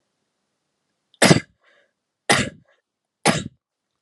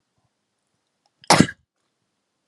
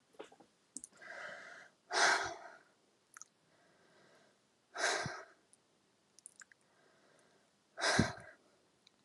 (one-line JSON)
{"three_cough_length": "4.0 s", "three_cough_amplitude": 32768, "three_cough_signal_mean_std_ratio": 0.25, "cough_length": "2.5 s", "cough_amplitude": 32735, "cough_signal_mean_std_ratio": 0.18, "exhalation_length": "9.0 s", "exhalation_amplitude": 6086, "exhalation_signal_mean_std_ratio": 0.32, "survey_phase": "beta (2021-08-13 to 2022-03-07)", "age": "18-44", "gender": "Male", "wearing_mask": "No", "symptom_cough_any": true, "symptom_runny_or_blocked_nose": true, "symptom_sore_throat": true, "symptom_onset": "2 days", "smoker_status": "Never smoked", "respiratory_condition_asthma": false, "respiratory_condition_other": false, "recruitment_source": "Test and Trace", "submission_delay": "2 days", "covid_test_result": "Negative", "covid_test_method": "RT-qPCR"}